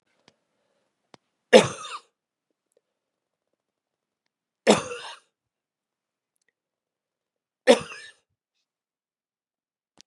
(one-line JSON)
{"three_cough_length": "10.1 s", "three_cough_amplitude": 32225, "three_cough_signal_mean_std_ratio": 0.16, "survey_phase": "beta (2021-08-13 to 2022-03-07)", "age": "65+", "gender": "Male", "wearing_mask": "No", "symptom_cough_any": true, "symptom_runny_or_blocked_nose": true, "smoker_status": "Ex-smoker", "respiratory_condition_asthma": false, "respiratory_condition_other": false, "recruitment_source": "REACT", "submission_delay": "1 day", "covid_test_result": "Negative", "covid_test_method": "RT-qPCR", "influenza_a_test_result": "Negative", "influenza_b_test_result": "Negative"}